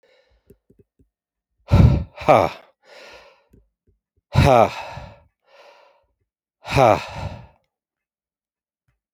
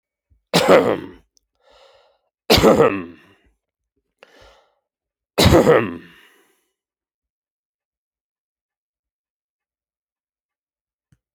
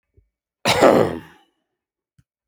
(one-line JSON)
{"exhalation_length": "9.1 s", "exhalation_amplitude": 28407, "exhalation_signal_mean_std_ratio": 0.29, "three_cough_length": "11.3 s", "three_cough_amplitude": 32767, "three_cough_signal_mean_std_ratio": 0.28, "cough_length": "2.5 s", "cough_amplitude": 27708, "cough_signal_mean_std_ratio": 0.33, "survey_phase": "alpha (2021-03-01 to 2021-08-12)", "age": "45-64", "gender": "Male", "wearing_mask": "No", "symptom_none": true, "smoker_status": "Ex-smoker", "respiratory_condition_asthma": false, "respiratory_condition_other": false, "recruitment_source": "REACT", "submission_delay": "3 days", "covid_test_result": "Negative", "covid_test_method": "RT-qPCR"}